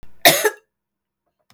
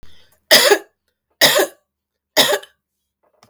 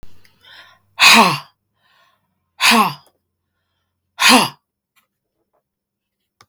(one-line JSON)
{"cough_length": "1.5 s", "cough_amplitude": 32766, "cough_signal_mean_std_ratio": 0.31, "three_cough_length": "3.5 s", "three_cough_amplitude": 32768, "three_cough_signal_mean_std_ratio": 0.37, "exhalation_length": "6.5 s", "exhalation_amplitude": 32768, "exhalation_signal_mean_std_ratio": 0.31, "survey_phase": "beta (2021-08-13 to 2022-03-07)", "age": "18-44", "gender": "Female", "wearing_mask": "No", "symptom_runny_or_blocked_nose": true, "symptom_headache": true, "symptom_other": true, "symptom_onset": "5 days", "smoker_status": "Never smoked", "respiratory_condition_asthma": false, "respiratory_condition_other": false, "recruitment_source": "Test and Trace", "submission_delay": "3 days", "covid_test_result": "Positive", "covid_test_method": "RT-qPCR", "covid_ct_value": 15.3, "covid_ct_gene": "N gene", "covid_ct_mean": 15.7, "covid_viral_load": "7300000 copies/ml", "covid_viral_load_category": "High viral load (>1M copies/ml)"}